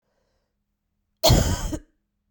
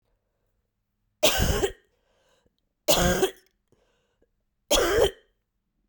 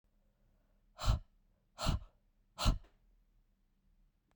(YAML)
cough_length: 2.3 s
cough_amplitude: 22412
cough_signal_mean_std_ratio: 0.35
three_cough_length: 5.9 s
three_cough_amplitude: 16320
three_cough_signal_mean_std_ratio: 0.38
exhalation_length: 4.4 s
exhalation_amplitude: 4234
exhalation_signal_mean_std_ratio: 0.28
survey_phase: beta (2021-08-13 to 2022-03-07)
age: 18-44
gender: Female
wearing_mask: 'No'
symptom_cough_any: true
symptom_sore_throat: true
symptom_fatigue: true
symptom_headache: true
symptom_other: true
symptom_onset: 4 days
smoker_status: Never smoked
respiratory_condition_asthma: false
respiratory_condition_other: false
recruitment_source: Test and Trace
submission_delay: 2 days
covid_test_result: Positive
covid_test_method: RT-qPCR
covid_ct_value: 24.0
covid_ct_gene: ORF1ab gene
covid_ct_mean: 24.5
covid_viral_load: 9400 copies/ml
covid_viral_load_category: Minimal viral load (< 10K copies/ml)